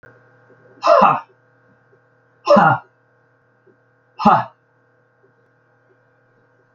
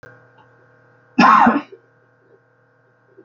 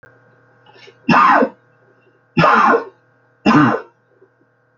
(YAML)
exhalation_length: 6.7 s
exhalation_amplitude: 28085
exhalation_signal_mean_std_ratio: 0.3
cough_length: 3.2 s
cough_amplitude: 28721
cough_signal_mean_std_ratio: 0.31
three_cough_length: 4.8 s
three_cough_amplitude: 28950
three_cough_signal_mean_std_ratio: 0.44
survey_phase: alpha (2021-03-01 to 2021-08-12)
age: 45-64
gender: Male
wearing_mask: 'No'
symptom_prefer_not_to_say: true
smoker_status: Never smoked
respiratory_condition_asthma: false
respiratory_condition_other: true
recruitment_source: REACT
submission_delay: 2 days
covid_test_result: Negative
covid_test_method: RT-qPCR